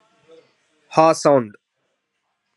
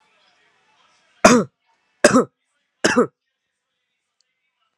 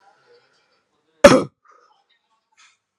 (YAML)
exhalation_length: 2.6 s
exhalation_amplitude: 30853
exhalation_signal_mean_std_ratio: 0.3
three_cough_length: 4.8 s
three_cough_amplitude: 32768
three_cough_signal_mean_std_ratio: 0.26
cough_length: 3.0 s
cough_amplitude: 32768
cough_signal_mean_std_ratio: 0.18
survey_phase: alpha (2021-03-01 to 2021-08-12)
age: 18-44
gender: Male
wearing_mask: 'Yes'
symptom_fever_high_temperature: true
symptom_change_to_sense_of_smell_or_taste: true
symptom_loss_of_taste: true
symptom_onset: 3 days
smoker_status: Ex-smoker
respiratory_condition_asthma: false
respiratory_condition_other: false
recruitment_source: Test and Trace
submission_delay: 2 days
covid_test_result: Positive
covid_test_method: RT-qPCR
covid_ct_value: 13.9
covid_ct_gene: ORF1ab gene
covid_ct_mean: 14.5
covid_viral_load: 18000000 copies/ml
covid_viral_load_category: High viral load (>1M copies/ml)